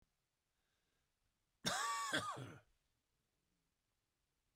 cough_length: 4.6 s
cough_amplitude: 1866
cough_signal_mean_std_ratio: 0.35
survey_phase: beta (2021-08-13 to 2022-03-07)
age: 45-64
gender: Male
wearing_mask: 'No'
symptom_cough_any: true
symptom_shortness_of_breath: true
symptom_sore_throat: true
symptom_change_to_sense_of_smell_or_taste: true
symptom_other: true
smoker_status: Ex-smoker
respiratory_condition_asthma: false
respiratory_condition_other: false
recruitment_source: Test and Trace
submission_delay: 0 days
covid_test_result: Positive
covid_test_method: LFT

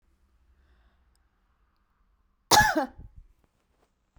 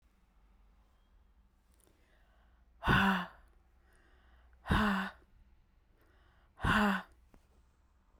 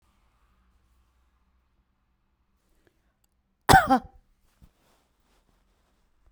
cough_length: 4.2 s
cough_amplitude: 19747
cough_signal_mean_std_ratio: 0.22
exhalation_length: 8.2 s
exhalation_amplitude: 5965
exhalation_signal_mean_std_ratio: 0.34
three_cough_length: 6.3 s
three_cough_amplitude: 28538
three_cough_signal_mean_std_ratio: 0.16
survey_phase: beta (2021-08-13 to 2022-03-07)
age: 45-64
gender: Female
wearing_mask: 'No'
symptom_none: true
smoker_status: Never smoked
respiratory_condition_asthma: false
respiratory_condition_other: false
recruitment_source: REACT
submission_delay: 1 day
covid_test_result: Negative
covid_test_method: RT-qPCR
influenza_a_test_result: Unknown/Void
influenza_b_test_result: Unknown/Void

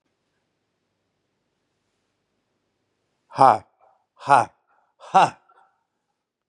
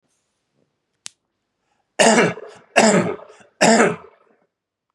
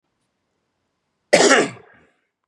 exhalation_length: 6.5 s
exhalation_amplitude: 30990
exhalation_signal_mean_std_ratio: 0.2
three_cough_length: 4.9 s
three_cough_amplitude: 32652
three_cough_signal_mean_std_ratio: 0.37
cough_length: 2.5 s
cough_amplitude: 32650
cough_signal_mean_std_ratio: 0.3
survey_phase: beta (2021-08-13 to 2022-03-07)
age: 45-64
gender: Male
wearing_mask: 'No'
symptom_new_continuous_cough: true
symptom_sore_throat: true
symptom_abdominal_pain: true
symptom_diarrhoea: true
symptom_fatigue: true
symptom_headache: true
smoker_status: Ex-smoker
respiratory_condition_asthma: false
respiratory_condition_other: false
recruitment_source: Test and Trace
submission_delay: 2 days
covid_test_result: Positive
covid_test_method: RT-qPCR
covid_ct_value: 11.5
covid_ct_gene: ORF1ab gene
covid_ct_mean: 11.9
covid_viral_load: 120000000 copies/ml
covid_viral_load_category: High viral load (>1M copies/ml)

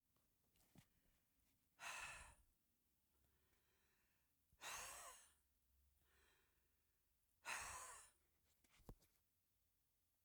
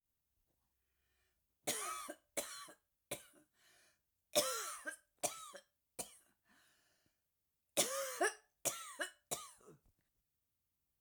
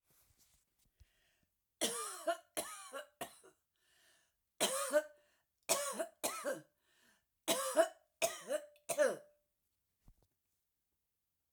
exhalation_length: 10.2 s
exhalation_amplitude: 530
exhalation_signal_mean_std_ratio: 0.39
cough_length: 11.0 s
cough_amplitude: 3436
cough_signal_mean_std_ratio: 0.34
three_cough_length: 11.5 s
three_cough_amplitude: 4682
three_cough_signal_mean_std_ratio: 0.36
survey_phase: alpha (2021-03-01 to 2021-08-12)
age: 65+
gender: Female
wearing_mask: 'No'
symptom_none: true
smoker_status: Ex-smoker
respiratory_condition_asthma: false
respiratory_condition_other: false
recruitment_source: REACT
submission_delay: 3 days
covid_test_result: Negative
covid_test_method: RT-qPCR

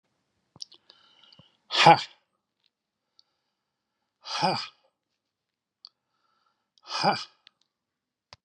exhalation_length: 8.4 s
exhalation_amplitude: 27050
exhalation_signal_mean_std_ratio: 0.21
survey_phase: beta (2021-08-13 to 2022-03-07)
age: 65+
gender: Male
wearing_mask: 'No'
symptom_none: true
smoker_status: Ex-smoker
respiratory_condition_asthma: false
respiratory_condition_other: false
recruitment_source: REACT
submission_delay: 3 days
covid_test_result: Negative
covid_test_method: RT-qPCR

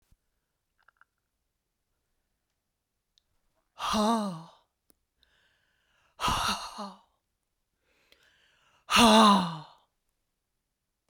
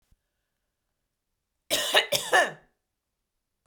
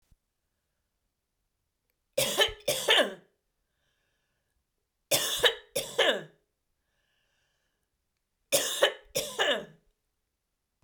exhalation_length: 11.1 s
exhalation_amplitude: 15314
exhalation_signal_mean_std_ratio: 0.28
cough_length: 3.7 s
cough_amplitude: 17618
cough_signal_mean_std_ratio: 0.31
three_cough_length: 10.8 s
three_cough_amplitude: 12839
three_cough_signal_mean_std_ratio: 0.34
survey_phase: beta (2021-08-13 to 2022-03-07)
age: 45-64
gender: Female
wearing_mask: 'No'
symptom_cough_any: true
symptom_fatigue: true
smoker_status: Never smoked
respiratory_condition_asthma: false
respiratory_condition_other: false
recruitment_source: Test and Trace
submission_delay: 2 days
covid_test_result: Positive
covid_test_method: RT-qPCR
covid_ct_value: 22.0
covid_ct_gene: ORF1ab gene
covid_ct_mean: 22.4
covid_viral_load: 46000 copies/ml
covid_viral_load_category: Low viral load (10K-1M copies/ml)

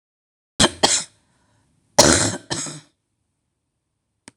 cough_length: 4.4 s
cough_amplitude: 26028
cough_signal_mean_std_ratio: 0.31
survey_phase: beta (2021-08-13 to 2022-03-07)
age: 65+
gender: Female
wearing_mask: 'No'
symptom_cough_any: true
symptom_shortness_of_breath: true
symptom_sore_throat: true
symptom_fatigue: true
symptom_loss_of_taste: true
symptom_onset: 12 days
smoker_status: Never smoked
respiratory_condition_asthma: false
respiratory_condition_other: true
recruitment_source: REACT
submission_delay: 2 days
covid_test_result: Negative
covid_test_method: RT-qPCR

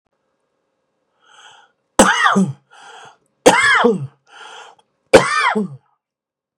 three_cough_length: 6.6 s
three_cough_amplitude: 32768
three_cough_signal_mean_std_ratio: 0.39
survey_phase: beta (2021-08-13 to 2022-03-07)
age: 45-64
gender: Male
wearing_mask: 'No'
symptom_cough_any: true
symptom_sore_throat: true
symptom_onset: 7 days
smoker_status: Ex-smoker
recruitment_source: Test and Trace
submission_delay: 3 days
covid_test_result: Negative
covid_test_method: RT-qPCR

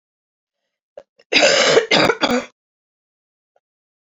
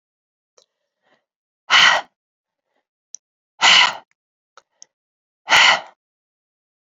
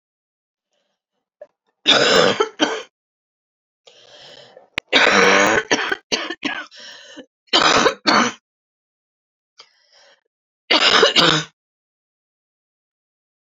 cough_length: 4.2 s
cough_amplitude: 32767
cough_signal_mean_std_ratio: 0.39
exhalation_length: 6.8 s
exhalation_amplitude: 32149
exhalation_signal_mean_std_ratio: 0.29
three_cough_length: 13.5 s
three_cough_amplitude: 32767
three_cough_signal_mean_std_ratio: 0.4
survey_phase: alpha (2021-03-01 to 2021-08-12)
age: 18-44
gender: Female
wearing_mask: 'No'
symptom_new_continuous_cough: true
symptom_shortness_of_breath: true
symptom_fever_high_temperature: true
symptom_headache: true
symptom_change_to_sense_of_smell_or_taste: true
symptom_onset: 3 days
smoker_status: Ex-smoker
respiratory_condition_asthma: false
respiratory_condition_other: false
recruitment_source: Test and Trace
submission_delay: 1 day
covid_test_result: Positive
covid_test_method: RT-qPCR
covid_ct_value: 16.7
covid_ct_gene: ORF1ab gene
covid_ct_mean: 17.1
covid_viral_load: 2500000 copies/ml
covid_viral_load_category: High viral load (>1M copies/ml)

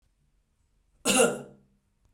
cough_length: 2.1 s
cough_amplitude: 12034
cough_signal_mean_std_ratio: 0.31
survey_phase: beta (2021-08-13 to 2022-03-07)
age: 45-64
gender: Male
wearing_mask: 'No'
symptom_none: true
smoker_status: Never smoked
respiratory_condition_asthma: false
respiratory_condition_other: false
recruitment_source: REACT
submission_delay: 1 day
covid_test_result: Negative
covid_test_method: RT-qPCR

